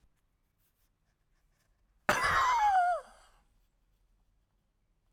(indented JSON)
{
  "cough_length": "5.1 s",
  "cough_amplitude": 9524,
  "cough_signal_mean_std_ratio": 0.38,
  "survey_phase": "alpha (2021-03-01 to 2021-08-12)",
  "age": "65+",
  "gender": "Male",
  "wearing_mask": "No",
  "symptom_none": true,
  "smoker_status": "Ex-smoker",
  "respiratory_condition_asthma": false,
  "respiratory_condition_other": true,
  "recruitment_source": "REACT",
  "submission_delay": "1 day",
  "covid_test_result": "Negative",
  "covid_test_method": "RT-qPCR"
}